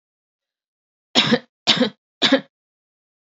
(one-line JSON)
{"three_cough_length": "3.2 s", "three_cough_amplitude": 29162, "three_cough_signal_mean_std_ratio": 0.32, "survey_phase": "beta (2021-08-13 to 2022-03-07)", "age": "18-44", "gender": "Female", "wearing_mask": "No", "symptom_none": true, "smoker_status": "Never smoked", "respiratory_condition_asthma": false, "respiratory_condition_other": false, "recruitment_source": "REACT", "submission_delay": "3 days", "covid_test_result": "Negative", "covid_test_method": "RT-qPCR", "influenza_a_test_result": "Unknown/Void", "influenza_b_test_result": "Unknown/Void"}